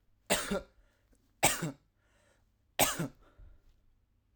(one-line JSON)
{"three_cough_length": "4.4 s", "three_cough_amplitude": 8934, "three_cough_signal_mean_std_ratio": 0.33, "survey_phase": "alpha (2021-03-01 to 2021-08-12)", "age": "18-44", "gender": "Male", "wearing_mask": "No", "symptom_headache": true, "symptom_onset": "4 days", "smoker_status": "Never smoked", "respiratory_condition_asthma": false, "respiratory_condition_other": false, "recruitment_source": "REACT", "submission_delay": "2 days", "covid_test_result": "Negative", "covid_test_method": "RT-qPCR"}